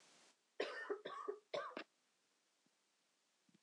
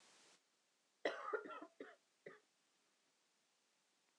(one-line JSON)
{"three_cough_length": "3.6 s", "three_cough_amplitude": 1235, "three_cough_signal_mean_std_ratio": 0.42, "cough_length": "4.2 s", "cough_amplitude": 1837, "cough_signal_mean_std_ratio": 0.31, "survey_phase": "alpha (2021-03-01 to 2021-08-12)", "age": "18-44", "gender": "Female", "wearing_mask": "No", "symptom_cough_any": true, "symptom_diarrhoea": true, "symptom_fatigue": true, "symptom_onset": "3 days", "smoker_status": "Never smoked", "respiratory_condition_asthma": false, "respiratory_condition_other": false, "recruitment_source": "Test and Trace", "submission_delay": "2 days", "covid_test_result": "Positive", "covid_test_method": "RT-qPCR", "covid_ct_value": 14.5, "covid_ct_gene": "ORF1ab gene", "covid_ct_mean": 14.8, "covid_viral_load": "14000000 copies/ml", "covid_viral_load_category": "High viral load (>1M copies/ml)"}